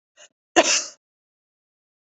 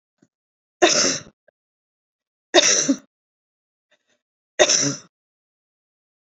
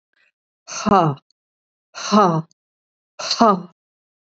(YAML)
cough_length: 2.1 s
cough_amplitude: 26618
cough_signal_mean_std_ratio: 0.26
three_cough_length: 6.2 s
three_cough_amplitude: 32329
three_cough_signal_mean_std_ratio: 0.32
exhalation_length: 4.4 s
exhalation_amplitude: 27745
exhalation_signal_mean_std_ratio: 0.37
survey_phase: beta (2021-08-13 to 2022-03-07)
age: 65+
gender: Female
wearing_mask: 'No'
symptom_none: true
smoker_status: Never smoked
respiratory_condition_asthma: false
respiratory_condition_other: false
recruitment_source: REACT
submission_delay: 1 day
covid_test_result: Negative
covid_test_method: RT-qPCR
influenza_a_test_result: Negative
influenza_b_test_result: Negative